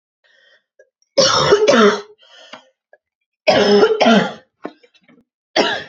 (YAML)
cough_length: 5.9 s
cough_amplitude: 31857
cough_signal_mean_std_ratio: 0.49
survey_phase: beta (2021-08-13 to 2022-03-07)
age: 18-44
gender: Female
wearing_mask: 'No'
symptom_cough_any: true
symptom_sore_throat: true
symptom_fever_high_temperature: true
symptom_headache: true
smoker_status: Ex-smoker
respiratory_condition_asthma: false
respiratory_condition_other: false
recruitment_source: Test and Trace
submission_delay: 2 days
covid_test_result: Positive
covid_test_method: RT-qPCR
covid_ct_value: 25.7
covid_ct_gene: ORF1ab gene
covid_ct_mean: 26.2
covid_viral_load: 2500 copies/ml
covid_viral_load_category: Minimal viral load (< 10K copies/ml)